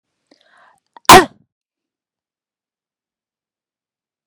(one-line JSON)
{"cough_length": "4.3 s", "cough_amplitude": 32768, "cough_signal_mean_std_ratio": 0.16, "survey_phase": "beta (2021-08-13 to 2022-03-07)", "age": "45-64", "gender": "Female", "wearing_mask": "No", "symptom_none": true, "smoker_status": "Never smoked", "respiratory_condition_asthma": false, "respiratory_condition_other": false, "recruitment_source": "REACT", "submission_delay": "3 days", "covid_test_result": "Negative", "covid_test_method": "RT-qPCR", "influenza_a_test_result": "Unknown/Void", "influenza_b_test_result": "Unknown/Void"}